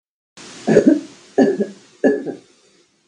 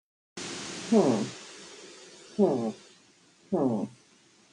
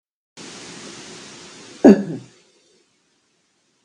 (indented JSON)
{
  "three_cough_length": "3.1 s",
  "three_cough_amplitude": 32766,
  "three_cough_signal_mean_std_ratio": 0.42,
  "exhalation_length": "4.5 s",
  "exhalation_amplitude": 10605,
  "exhalation_signal_mean_std_ratio": 0.46,
  "cough_length": "3.8 s",
  "cough_amplitude": 32768,
  "cough_signal_mean_std_ratio": 0.21,
  "survey_phase": "beta (2021-08-13 to 2022-03-07)",
  "age": "45-64",
  "gender": "Female",
  "wearing_mask": "No",
  "symptom_none": true,
  "smoker_status": "Current smoker (1 to 10 cigarettes per day)",
  "respiratory_condition_asthma": false,
  "respiratory_condition_other": false,
  "recruitment_source": "REACT",
  "submission_delay": "1 day",
  "covid_test_result": "Negative",
  "covid_test_method": "RT-qPCR"
}